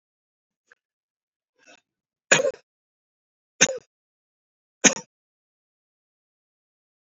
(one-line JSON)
{"three_cough_length": "7.2 s", "three_cough_amplitude": 27645, "three_cough_signal_mean_std_ratio": 0.16, "survey_phase": "beta (2021-08-13 to 2022-03-07)", "age": "65+", "gender": "Male", "wearing_mask": "No", "symptom_none": true, "smoker_status": "Never smoked", "respiratory_condition_asthma": true, "respiratory_condition_other": false, "recruitment_source": "REACT", "submission_delay": "3 days", "covid_test_result": "Negative", "covid_test_method": "RT-qPCR", "influenza_a_test_result": "Negative", "influenza_b_test_result": "Negative"}